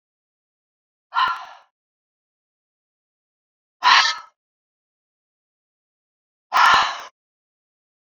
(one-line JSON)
{"exhalation_length": "8.1 s", "exhalation_amplitude": 28345, "exhalation_signal_mean_std_ratio": 0.27, "survey_phase": "beta (2021-08-13 to 2022-03-07)", "age": "45-64", "gender": "Female", "wearing_mask": "No", "symptom_none": true, "smoker_status": "Never smoked", "respiratory_condition_asthma": false, "respiratory_condition_other": false, "recruitment_source": "REACT", "submission_delay": "1 day", "covid_test_result": "Negative", "covid_test_method": "RT-qPCR"}